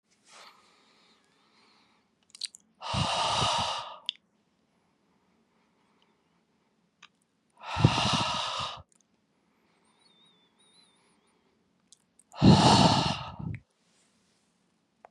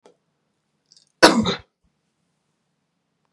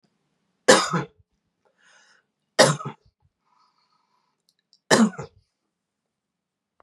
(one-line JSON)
{"exhalation_length": "15.1 s", "exhalation_amplitude": 18292, "exhalation_signal_mean_std_ratio": 0.31, "cough_length": "3.3 s", "cough_amplitude": 32768, "cough_signal_mean_std_ratio": 0.21, "three_cough_length": "6.8 s", "three_cough_amplitude": 32767, "three_cough_signal_mean_std_ratio": 0.24, "survey_phase": "beta (2021-08-13 to 2022-03-07)", "age": "18-44", "gender": "Female", "wearing_mask": "No", "symptom_none": true, "smoker_status": "Ex-smoker", "respiratory_condition_asthma": false, "respiratory_condition_other": false, "recruitment_source": "REACT", "submission_delay": "1 day", "covid_test_result": "Negative", "covid_test_method": "RT-qPCR", "influenza_a_test_result": "Negative", "influenza_b_test_result": "Negative"}